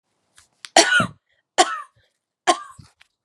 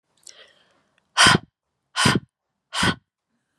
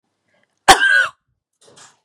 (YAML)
three_cough_length: 3.2 s
three_cough_amplitude: 32767
three_cough_signal_mean_std_ratio: 0.31
exhalation_length: 3.6 s
exhalation_amplitude: 28082
exhalation_signal_mean_std_ratio: 0.32
cough_length: 2.0 s
cough_amplitude: 32768
cough_signal_mean_std_ratio: 0.33
survey_phase: beta (2021-08-13 to 2022-03-07)
age: 18-44
gender: Female
wearing_mask: 'No'
symptom_none: true
smoker_status: Never smoked
respiratory_condition_asthma: false
respiratory_condition_other: false
recruitment_source: REACT
submission_delay: 1 day
covid_test_result: Negative
covid_test_method: RT-qPCR
influenza_a_test_result: Negative
influenza_b_test_result: Negative